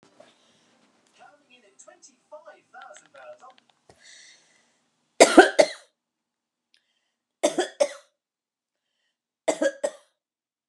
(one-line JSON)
{"three_cough_length": "10.7 s", "three_cough_amplitude": 32463, "three_cough_signal_mean_std_ratio": 0.19, "survey_phase": "beta (2021-08-13 to 2022-03-07)", "age": "65+", "gender": "Female", "wearing_mask": "No", "symptom_none": true, "smoker_status": "Never smoked", "respiratory_condition_asthma": false, "respiratory_condition_other": false, "recruitment_source": "REACT", "submission_delay": "1 day", "covid_test_result": "Negative", "covid_test_method": "RT-qPCR", "influenza_a_test_result": "Negative", "influenza_b_test_result": "Negative"}